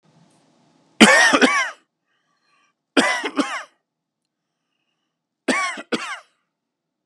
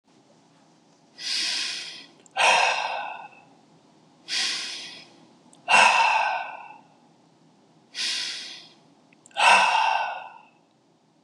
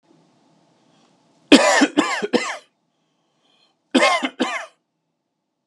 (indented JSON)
{
  "three_cough_length": "7.1 s",
  "three_cough_amplitude": 32768,
  "three_cough_signal_mean_std_ratio": 0.34,
  "exhalation_length": "11.2 s",
  "exhalation_amplitude": 21261,
  "exhalation_signal_mean_std_ratio": 0.46,
  "cough_length": "5.7 s",
  "cough_amplitude": 32768,
  "cough_signal_mean_std_ratio": 0.35,
  "survey_phase": "beta (2021-08-13 to 2022-03-07)",
  "age": "45-64",
  "gender": "Male",
  "wearing_mask": "No",
  "symptom_runny_or_blocked_nose": true,
  "smoker_status": "Never smoked",
  "respiratory_condition_asthma": true,
  "respiratory_condition_other": false,
  "recruitment_source": "REACT",
  "submission_delay": "2 days",
  "covid_test_result": "Negative",
  "covid_test_method": "RT-qPCR"
}